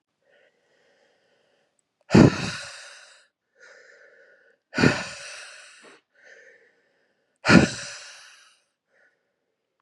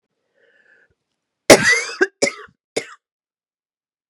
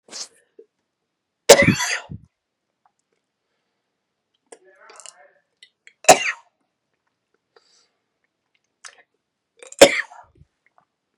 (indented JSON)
{
  "exhalation_length": "9.8 s",
  "exhalation_amplitude": 30959,
  "exhalation_signal_mean_std_ratio": 0.23,
  "cough_length": "4.1 s",
  "cough_amplitude": 32768,
  "cough_signal_mean_std_ratio": 0.25,
  "three_cough_length": "11.2 s",
  "three_cough_amplitude": 32768,
  "three_cough_signal_mean_std_ratio": 0.18,
  "survey_phase": "beta (2021-08-13 to 2022-03-07)",
  "age": "18-44",
  "gender": "Female",
  "wearing_mask": "No",
  "symptom_cough_any": true,
  "symptom_new_continuous_cough": true,
  "symptom_shortness_of_breath": true,
  "symptom_fatigue": true,
  "symptom_onset": "2 days",
  "smoker_status": "Never smoked",
  "respiratory_condition_asthma": false,
  "respiratory_condition_other": false,
  "recruitment_source": "Test and Trace",
  "submission_delay": "1 day",
  "covid_test_result": "Positive",
  "covid_test_method": "RT-qPCR",
  "covid_ct_value": 24.7,
  "covid_ct_gene": "ORF1ab gene"
}